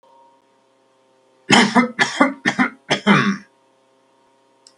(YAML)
cough_length: 4.8 s
cough_amplitude: 32768
cough_signal_mean_std_ratio: 0.39
survey_phase: beta (2021-08-13 to 2022-03-07)
age: 65+
gender: Male
wearing_mask: 'No'
symptom_none: true
symptom_onset: 12 days
smoker_status: Never smoked
respiratory_condition_asthma: false
respiratory_condition_other: false
recruitment_source: REACT
submission_delay: 3 days
covid_test_result: Negative
covid_test_method: RT-qPCR
influenza_a_test_result: Negative
influenza_b_test_result: Negative